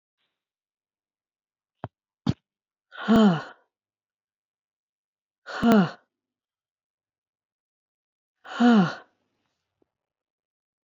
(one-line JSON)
{"exhalation_length": "10.8 s", "exhalation_amplitude": 14879, "exhalation_signal_mean_std_ratio": 0.26, "survey_phase": "alpha (2021-03-01 to 2021-08-12)", "age": "65+", "gender": "Female", "wearing_mask": "No", "symptom_none": true, "smoker_status": "Ex-smoker", "respiratory_condition_asthma": false, "respiratory_condition_other": false, "recruitment_source": "REACT", "covid_test_method": "RT-qPCR"}